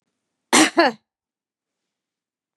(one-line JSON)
{"cough_length": "2.6 s", "cough_amplitude": 32385, "cough_signal_mean_std_ratio": 0.26, "survey_phase": "beta (2021-08-13 to 2022-03-07)", "age": "65+", "gender": "Female", "wearing_mask": "No", "symptom_none": true, "smoker_status": "Never smoked", "respiratory_condition_asthma": false, "respiratory_condition_other": false, "recruitment_source": "REACT", "submission_delay": "5 days", "covid_test_result": "Negative", "covid_test_method": "RT-qPCR", "influenza_a_test_result": "Negative", "influenza_b_test_result": "Negative"}